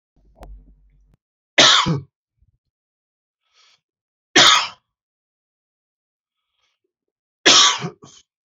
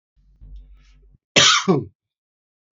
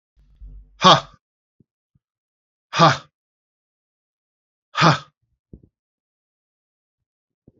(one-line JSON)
{"three_cough_length": "8.5 s", "three_cough_amplitude": 32767, "three_cough_signal_mean_std_ratio": 0.28, "cough_length": "2.7 s", "cough_amplitude": 29412, "cough_signal_mean_std_ratio": 0.33, "exhalation_length": "7.6 s", "exhalation_amplitude": 28387, "exhalation_signal_mean_std_ratio": 0.22, "survey_phase": "beta (2021-08-13 to 2022-03-07)", "age": "45-64", "gender": "Male", "wearing_mask": "No", "symptom_cough_any": true, "symptom_sore_throat": true, "smoker_status": "Never smoked", "respiratory_condition_asthma": false, "respiratory_condition_other": false, "recruitment_source": "Test and Trace", "submission_delay": "2 days", "covid_test_result": "Positive", "covid_test_method": "RT-qPCR", "covid_ct_value": 14.0, "covid_ct_gene": "ORF1ab gene", "covid_ct_mean": 14.1, "covid_viral_load": "23000000 copies/ml", "covid_viral_load_category": "High viral load (>1M copies/ml)"}